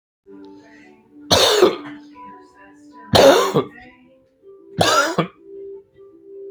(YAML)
three_cough_length: 6.5 s
three_cough_amplitude: 32706
three_cough_signal_mean_std_ratio: 0.41
survey_phase: beta (2021-08-13 to 2022-03-07)
age: 18-44
gender: Male
wearing_mask: 'No'
symptom_none: true
smoker_status: Ex-smoker
respiratory_condition_asthma: false
respiratory_condition_other: false
recruitment_source: REACT
submission_delay: 1 day
covid_test_result: Negative
covid_test_method: RT-qPCR
influenza_a_test_result: Negative
influenza_b_test_result: Negative